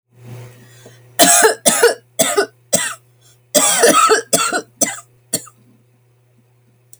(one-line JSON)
{"cough_length": "7.0 s", "cough_amplitude": 32768, "cough_signal_mean_std_ratio": 0.46, "survey_phase": "alpha (2021-03-01 to 2021-08-12)", "age": "45-64", "gender": "Female", "wearing_mask": "No", "symptom_shortness_of_breath": true, "symptom_fatigue": true, "symptom_headache": true, "smoker_status": "Never smoked", "respiratory_condition_asthma": false, "respiratory_condition_other": false, "recruitment_source": "REACT", "submission_delay": "1 day", "covid_test_result": "Negative", "covid_test_method": "RT-qPCR"}